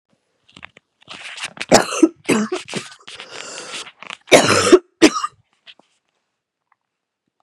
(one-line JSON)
{"cough_length": "7.4 s", "cough_amplitude": 32768, "cough_signal_mean_std_ratio": 0.32, "survey_phase": "beta (2021-08-13 to 2022-03-07)", "age": "18-44", "gender": "Female", "wearing_mask": "No", "symptom_new_continuous_cough": true, "symptom_runny_or_blocked_nose": true, "symptom_sore_throat": true, "symptom_fatigue": true, "symptom_headache": true, "symptom_onset": "4 days", "smoker_status": "Never smoked", "respiratory_condition_asthma": false, "respiratory_condition_other": true, "recruitment_source": "Test and Trace", "submission_delay": "2 days", "covid_test_result": "Positive", "covid_test_method": "RT-qPCR", "covid_ct_value": 21.4, "covid_ct_gene": "ORF1ab gene", "covid_ct_mean": 21.8, "covid_viral_load": "71000 copies/ml", "covid_viral_load_category": "Low viral load (10K-1M copies/ml)"}